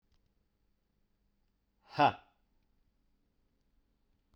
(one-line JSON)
{"exhalation_length": "4.4 s", "exhalation_amplitude": 6258, "exhalation_signal_mean_std_ratio": 0.16, "survey_phase": "beta (2021-08-13 to 2022-03-07)", "age": "18-44", "gender": "Male", "wearing_mask": "No", "symptom_cough_any": true, "symptom_runny_or_blocked_nose": true, "symptom_fatigue": true, "symptom_headache": true, "symptom_change_to_sense_of_smell_or_taste": true, "symptom_loss_of_taste": true, "symptom_onset": "2 days", "smoker_status": "Never smoked", "respiratory_condition_asthma": false, "respiratory_condition_other": false, "recruitment_source": "Test and Trace", "submission_delay": "1 day", "covid_test_result": "Positive", "covid_test_method": "RT-qPCR", "covid_ct_value": 16.1, "covid_ct_gene": "ORF1ab gene", "covid_ct_mean": 16.9, "covid_viral_load": "2900000 copies/ml", "covid_viral_load_category": "High viral load (>1M copies/ml)"}